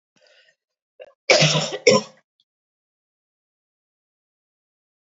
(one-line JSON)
{"cough_length": "5.0 s", "cough_amplitude": 29632, "cough_signal_mean_std_ratio": 0.26, "survey_phase": "alpha (2021-03-01 to 2021-08-12)", "age": "45-64", "gender": "Female", "wearing_mask": "No", "symptom_none": true, "smoker_status": "Never smoked", "respiratory_condition_asthma": false, "respiratory_condition_other": false, "recruitment_source": "REACT", "submission_delay": "4 days", "covid_test_result": "Negative", "covid_test_method": "RT-qPCR"}